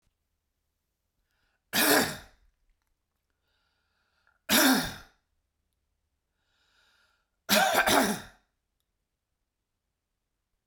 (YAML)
three_cough_length: 10.7 s
three_cough_amplitude: 13380
three_cough_signal_mean_std_ratio: 0.3
survey_phase: beta (2021-08-13 to 2022-03-07)
age: 18-44
gender: Male
wearing_mask: 'No'
symptom_none: true
smoker_status: Ex-smoker
respiratory_condition_asthma: false
respiratory_condition_other: false
recruitment_source: REACT
submission_delay: 1 day
covid_test_result: Negative
covid_test_method: RT-qPCR